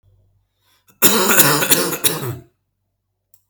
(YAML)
cough_length: 3.5 s
cough_amplitude: 32768
cough_signal_mean_std_ratio: 0.45
survey_phase: alpha (2021-03-01 to 2021-08-12)
age: 18-44
gender: Male
wearing_mask: 'No'
symptom_none: true
symptom_onset: 8 days
smoker_status: Never smoked
respiratory_condition_asthma: true
respiratory_condition_other: false
recruitment_source: REACT
submission_delay: 3 days
covid_test_result: Negative
covid_test_method: RT-qPCR